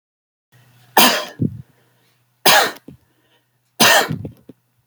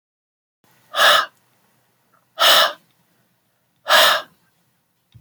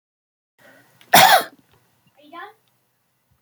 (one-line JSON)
{"three_cough_length": "4.9 s", "three_cough_amplitude": 32768, "three_cough_signal_mean_std_ratio": 0.35, "exhalation_length": "5.2 s", "exhalation_amplitude": 30378, "exhalation_signal_mean_std_ratio": 0.35, "cough_length": "3.4 s", "cough_amplitude": 32725, "cough_signal_mean_std_ratio": 0.25, "survey_phase": "beta (2021-08-13 to 2022-03-07)", "age": "45-64", "gender": "Male", "wearing_mask": "No", "symptom_runny_or_blocked_nose": true, "smoker_status": "Never smoked", "respiratory_condition_asthma": false, "respiratory_condition_other": false, "recruitment_source": "REACT", "submission_delay": "2 days", "covid_test_result": "Negative", "covid_test_method": "RT-qPCR"}